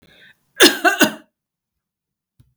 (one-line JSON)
{"cough_length": "2.6 s", "cough_amplitude": 32768, "cough_signal_mean_std_ratio": 0.29, "survey_phase": "beta (2021-08-13 to 2022-03-07)", "age": "45-64", "gender": "Female", "wearing_mask": "No", "symptom_none": true, "smoker_status": "Never smoked", "respiratory_condition_asthma": false, "respiratory_condition_other": false, "recruitment_source": "REACT", "submission_delay": "1 day", "covid_test_result": "Negative", "covid_test_method": "RT-qPCR", "influenza_a_test_result": "Negative", "influenza_b_test_result": "Negative"}